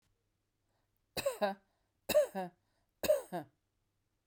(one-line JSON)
{"three_cough_length": "4.3 s", "three_cough_amplitude": 3672, "three_cough_signal_mean_std_ratio": 0.33, "survey_phase": "beta (2021-08-13 to 2022-03-07)", "age": "65+", "gender": "Female", "wearing_mask": "No", "symptom_none": true, "smoker_status": "Never smoked", "respiratory_condition_asthma": false, "respiratory_condition_other": false, "recruitment_source": "REACT", "submission_delay": "4 days", "covid_test_result": "Negative", "covid_test_method": "RT-qPCR", "influenza_a_test_result": "Negative", "influenza_b_test_result": "Negative"}